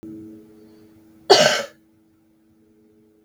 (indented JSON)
{
  "cough_length": "3.2 s",
  "cough_amplitude": 32768,
  "cough_signal_mean_std_ratio": 0.27,
  "survey_phase": "beta (2021-08-13 to 2022-03-07)",
  "age": "45-64",
  "gender": "Female",
  "wearing_mask": "No",
  "symptom_cough_any": true,
  "symptom_runny_or_blocked_nose": true,
  "symptom_headache": true,
  "symptom_change_to_sense_of_smell_or_taste": true,
  "symptom_other": true,
  "symptom_onset": "7 days",
  "smoker_status": "Never smoked",
  "respiratory_condition_asthma": false,
  "respiratory_condition_other": false,
  "recruitment_source": "Test and Trace",
  "submission_delay": "1 day",
  "covid_test_result": "Positive",
  "covid_test_method": "RT-qPCR",
  "covid_ct_value": 15.4,
  "covid_ct_gene": "ORF1ab gene",
  "covid_ct_mean": 16.9,
  "covid_viral_load": "2800000 copies/ml",
  "covid_viral_load_category": "High viral load (>1M copies/ml)"
}